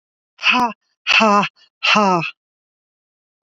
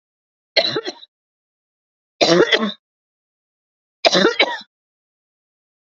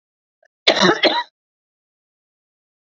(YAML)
exhalation_length: 3.6 s
exhalation_amplitude: 29804
exhalation_signal_mean_std_ratio: 0.45
three_cough_length: 6.0 s
three_cough_amplitude: 30240
three_cough_signal_mean_std_ratio: 0.33
cough_length: 2.9 s
cough_amplitude: 29221
cough_signal_mean_std_ratio: 0.31
survey_phase: alpha (2021-03-01 to 2021-08-12)
age: 45-64
gender: Female
wearing_mask: 'No'
symptom_none: true
smoker_status: Never smoked
respiratory_condition_asthma: false
respiratory_condition_other: false
recruitment_source: REACT
submission_delay: 2 days
covid_test_result: Negative
covid_test_method: RT-qPCR